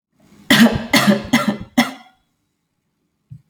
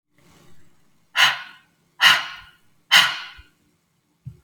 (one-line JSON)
{"cough_length": "3.5 s", "cough_amplitude": 32091, "cough_signal_mean_std_ratio": 0.41, "exhalation_length": "4.4 s", "exhalation_amplitude": 32768, "exhalation_signal_mean_std_ratio": 0.32, "survey_phase": "alpha (2021-03-01 to 2021-08-12)", "age": "18-44", "gender": "Female", "wearing_mask": "No", "symptom_none": true, "smoker_status": "Never smoked", "respiratory_condition_asthma": false, "respiratory_condition_other": false, "recruitment_source": "REACT", "submission_delay": "2 days", "covid_test_result": "Negative", "covid_test_method": "RT-qPCR"}